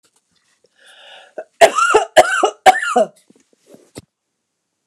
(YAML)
cough_length: 4.9 s
cough_amplitude: 29204
cough_signal_mean_std_ratio: 0.35
survey_phase: alpha (2021-03-01 to 2021-08-12)
age: 65+
gender: Female
wearing_mask: 'No'
symptom_none: true
smoker_status: Ex-smoker
respiratory_condition_asthma: true
respiratory_condition_other: false
recruitment_source: REACT
submission_delay: 2 days
covid_test_result: Negative
covid_test_method: RT-qPCR